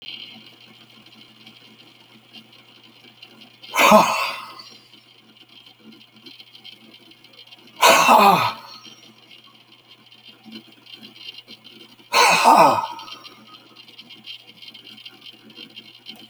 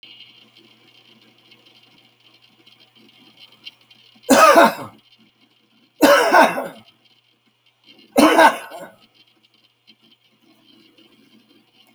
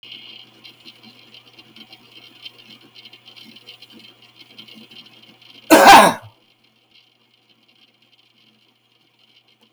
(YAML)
exhalation_length: 16.3 s
exhalation_amplitude: 30601
exhalation_signal_mean_std_ratio: 0.32
three_cough_length: 11.9 s
three_cough_amplitude: 29848
three_cough_signal_mean_std_ratio: 0.29
cough_length: 9.7 s
cough_amplitude: 32768
cough_signal_mean_std_ratio: 0.2
survey_phase: beta (2021-08-13 to 2022-03-07)
age: 65+
gender: Male
wearing_mask: 'No'
symptom_cough_any: true
smoker_status: Ex-smoker
respiratory_condition_asthma: true
respiratory_condition_other: false
recruitment_source: REACT
submission_delay: 4 days
covid_test_result: Negative
covid_test_method: RT-qPCR